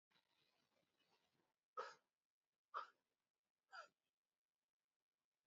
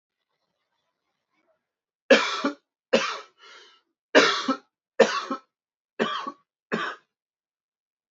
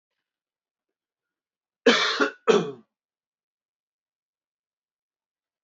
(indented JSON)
{
  "exhalation_length": "5.5 s",
  "exhalation_amplitude": 540,
  "exhalation_signal_mean_std_ratio": 0.21,
  "three_cough_length": "8.1 s",
  "three_cough_amplitude": 24270,
  "three_cough_signal_mean_std_ratio": 0.31,
  "cough_length": "5.6 s",
  "cough_amplitude": 19113,
  "cough_signal_mean_std_ratio": 0.24,
  "survey_phase": "alpha (2021-03-01 to 2021-08-12)",
  "age": "18-44",
  "gender": "Male",
  "wearing_mask": "No",
  "symptom_headache": true,
  "smoker_status": "Never smoked",
  "respiratory_condition_asthma": false,
  "respiratory_condition_other": false,
  "recruitment_source": "Test and Trace",
  "submission_delay": "2 days",
  "covid_test_result": "Positive",
  "covid_test_method": "LFT"
}